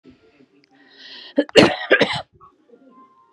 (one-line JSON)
{"cough_length": "3.3 s", "cough_amplitude": 32768, "cough_signal_mean_std_ratio": 0.3, "survey_phase": "beta (2021-08-13 to 2022-03-07)", "age": "18-44", "gender": "Female", "wearing_mask": "No", "symptom_cough_any": true, "symptom_shortness_of_breath": true, "symptom_fatigue": true, "symptom_change_to_sense_of_smell_or_taste": true, "symptom_onset": "13 days", "smoker_status": "Ex-smoker", "respiratory_condition_asthma": false, "respiratory_condition_other": false, "recruitment_source": "REACT", "submission_delay": "0 days", "covid_test_result": "Negative", "covid_test_method": "RT-qPCR"}